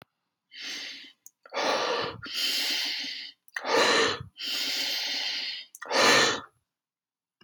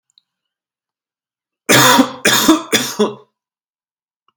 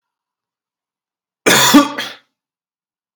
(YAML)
exhalation_length: 7.4 s
exhalation_amplitude: 13762
exhalation_signal_mean_std_ratio: 0.61
three_cough_length: 4.4 s
three_cough_amplitude: 32768
three_cough_signal_mean_std_ratio: 0.39
cough_length: 3.2 s
cough_amplitude: 32768
cough_signal_mean_std_ratio: 0.31
survey_phase: beta (2021-08-13 to 2022-03-07)
age: 18-44
gender: Male
wearing_mask: 'No'
symptom_cough_any: true
symptom_new_continuous_cough: true
symptom_runny_or_blocked_nose: true
symptom_sore_throat: true
symptom_fatigue: true
symptom_onset: 3 days
smoker_status: Ex-smoker
respiratory_condition_asthma: false
respiratory_condition_other: false
recruitment_source: Test and Trace
submission_delay: 2 days
covid_test_result: Positive
covid_test_method: RT-qPCR
covid_ct_value: 24.7
covid_ct_gene: N gene